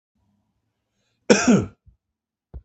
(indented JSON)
{
  "cough_length": "2.6 s",
  "cough_amplitude": 32766,
  "cough_signal_mean_std_ratio": 0.27,
  "survey_phase": "beta (2021-08-13 to 2022-03-07)",
  "age": "45-64",
  "gender": "Male",
  "wearing_mask": "No",
  "symptom_cough_any": true,
  "symptom_runny_or_blocked_nose": true,
  "symptom_fatigue": true,
  "symptom_headache": true,
  "symptom_change_to_sense_of_smell_or_taste": true,
  "smoker_status": "Never smoked",
  "respiratory_condition_asthma": true,
  "respiratory_condition_other": false,
  "recruitment_source": "Test and Trace",
  "submission_delay": "1 day",
  "covid_test_result": "Positive",
  "covid_test_method": "LFT"
}